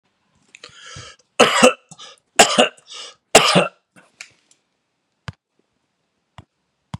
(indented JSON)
{
  "three_cough_length": "7.0 s",
  "three_cough_amplitude": 32768,
  "three_cough_signal_mean_std_ratio": 0.28,
  "survey_phase": "beta (2021-08-13 to 2022-03-07)",
  "age": "65+",
  "gender": "Male",
  "wearing_mask": "No",
  "symptom_cough_any": true,
  "symptom_runny_or_blocked_nose": true,
  "symptom_fever_high_temperature": true,
  "symptom_other": true,
  "symptom_onset": "3 days",
  "smoker_status": "Ex-smoker",
  "respiratory_condition_asthma": false,
  "respiratory_condition_other": false,
  "recruitment_source": "Test and Trace",
  "submission_delay": "2 days",
  "covid_test_result": "Positive",
  "covid_test_method": "RT-qPCR",
  "covid_ct_value": 23.7,
  "covid_ct_gene": "ORF1ab gene",
  "covid_ct_mean": 24.1,
  "covid_viral_load": "13000 copies/ml",
  "covid_viral_load_category": "Low viral load (10K-1M copies/ml)"
}